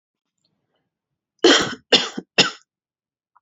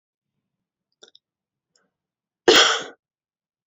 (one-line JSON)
{"three_cough_length": "3.4 s", "three_cough_amplitude": 32080, "three_cough_signal_mean_std_ratio": 0.29, "cough_length": "3.7 s", "cough_amplitude": 30065, "cough_signal_mean_std_ratio": 0.22, "survey_phase": "beta (2021-08-13 to 2022-03-07)", "age": "18-44", "gender": "Female", "wearing_mask": "No", "symptom_none": true, "smoker_status": "Never smoked", "respiratory_condition_asthma": false, "respiratory_condition_other": false, "recruitment_source": "REACT", "submission_delay": "0 days", "covid_test_result": "Negative", "covid_test_method": "RT-qPCR", "influenza_a_test_result": "Unknown/Void", "influenza_b_test_result": "Unknown/Void"}